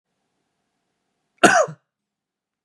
{
  "cough_length": "2.6 s",
  "cough_amplitude": 32767,
  "cough_signal_mean_std_ratio": 0.23,
  "survey_phase": "beta (2021-08-13 to 2022-03-07)",
  "age": "18-44",
  "gender": "Male",
  "wearing_mask": "No",
  "symptom_none": true,
  "smoker_status": "Never smoked",
  "respiratory_condition_asthma": false,
  "respiratory_condition_other": false,
  "recruitment_source": "REACT",
  "submission_delay": "3 days",
  "covid_test_result": "Negative",
  "covid_test_method": "RT-qPCR",
  "influenza_a_test_result": "Negative",
  "influenza_b_test_result": "Negative"
}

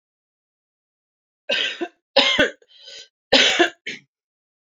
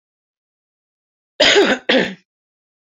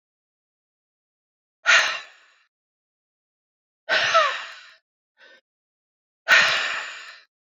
{
  "three_cough_length": "4.7 s",
  "three_cough_amplitude": 26764,
  "three_cough_signal_mean_std_ratio": 0.36,
  "cough_length": "2.8 s",
  "cough_amplitude": 30671,
  "cough_signal_mean_std_ratio": 0.37,
  "exhalation_length": "7.6 s",
  "exhalation_amplitude": 23225,
  "exhalation_signal_mean_std_ratio": 0.33,
  "survey_phase": "beta (2021-08-13 to 2022-03-07)",
  "age": "45-64",
  "gender": "Female",
  "wearing_mask": "No",
  "symptom_cough_any": true,
  "symptom_runny_or_blocked_nose": true,
  "symptom_sore_throat": true,
  "symptom_fatigue": true,
  "smoker_status": "Ex-smoker",
  "respiratory_condition_asthma": false,
  "respiratory_condition_other": false,
  "recruitment_source": "Test and Trace",
  "submission_delay": "2 days",
  "covid_test_result": "Positive",
  "covid_test_method": "RT-qPCR"
}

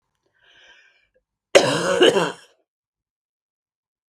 {
  "cough_length": "4.1 s",
  "cough_amplitude": 32768,
  "cough_signal_mean_std_ratio": 0.31,
  "survey_phase": "beta (2021-08-13 to 2022-03-07)",
  "age": "45-64",
  "gender": "Female",
  "wearing_mask": "No",
  "symptom_cough_any": true,
  "symptom_runny_or_blocked_nose": true,
  "symptom_sore_throat": true,
  "symptom_headache": true,
  "symptom_onset": "3 days",
  "smoker_status": "Ex-smoker",
  "respiratory_condition_asthma": false,
  "respiratory_condition_other": false,
  "recruitment_source": "Test and Trace",
  "submission_delay": "1 day",
  "covid_test_result": "Positive",
  "covid_test_method": "RT-qPCR",
  "covid_ct_value": 20.1,
  "covid_ct_gene": "ORF1ab gene"
}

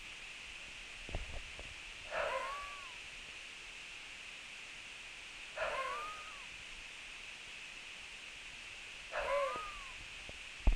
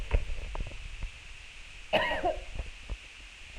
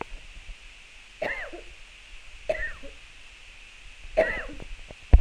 {
  "exhalation_length": "10.8 s",
  "exhalation_amplitude": 4384,
  "exhalation_signal_mean_std_ratio": 0.68,
  "cough_length": "3.6 s",
  "cough_amplitude": 7580,
  "cough_signal_mean_std_ratio": 0.68,
  "three_cough_length": "5.2 s",
  "three_cough_amplitude": 25752,
  "three_cough_signal_mean_std_ratio": 0.33,
  "survey_phase": "beta (2021-08-13 to 2022-03-07)",
  "age": "18-44",
  "gender": "Female",
  "wearing_mask": "No",
  "symptom_cough_any": true,
  "symptom_runny_or_blocked_nose": true,
  "symptom_sore_throat": true,
  "symptom_fatigue": true,
  "symptom_change_to_sense_of_smell_or_taste": true,
  "symptom_loss_of_taste": true,
  "smoker_status": "Never smoked",
  "respiratory_condition_asthma": false,
  "respiratory_condition_other": false,
  "recruitment_source": "Test and Trace",
  "submission_delay": "3 days",
  "covid_test_result": "Positive",
  "covid_test_method": "RT-qPCR",
  "covid_ct_value": 18.5,
  "covid_ct_gene": "ORF1ab gene"
}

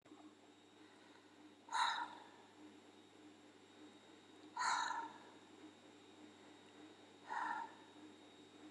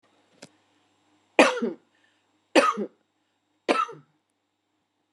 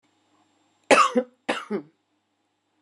{
  "exhalation_length": "8.7 s",
  "exhalation_amplitude": 2146,
  "exhalation_signal_mean_std_ratio": 0.48,
  "three_cough_length": "5.1 s",
  "three_cough_amplitude": 25318,
  "three_cough_signal_mean_std_ratio": 0.27,
  "cough_length": "2.8 s",
  "cough_amplitude": 26258,
  "cough_signal_mean_std_ratio": 0.29,
  "survey_phase": "beta (2021-08-13 to 2022-03-07)",
  "age": "45-64",
  "gender": "Female",
  "wearing_mask": "No",
  "symptom_none": true,
  "smoker_status": "Current smoker (11 or more cigarettes per day)",
  "respiratory_condition_asthma": false,
  "respiratory_condition_other": false,
  "recruitment_source": "REACT",
  "submission_delay": "2 days",
  "covid_test_result": "Negative",
  "covid_test_method": "RT-qPCR",
  "influenza_a_test_result": "Negative",
  "influenza_b_test_result": "Negative"
}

